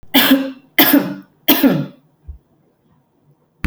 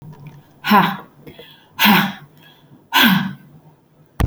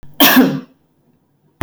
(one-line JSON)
{"three_cough_length": "3.7 s", "three_cough_amplitude": 32768, "three_cough_signal_mean_std_ratio": 0.44, "exhalation_length": "4.3 s", "exhalation_amplitude": 32768, "exhalation_signal_mean_std_ratio": 0.43, "cough_length": "1.6 s", "cough_amplitude": 32768, "cough_signal_mean_std_ratio": 0.42, "survey_phase": "beta (2021-08-13 to 2022-03-07)", "age": "45-64", "gender": "Female", "wearing_mask": "No", "symptom_none": true, "smoker_status": "Never smoked", "respiratory_condition_asthma": false, "respiratory_condition_other": false, "recruitment_source": "REACT", "submission_delay": "1 day", "covid_test_result": "Negative", "covid_test_method": "RT-qPCR"}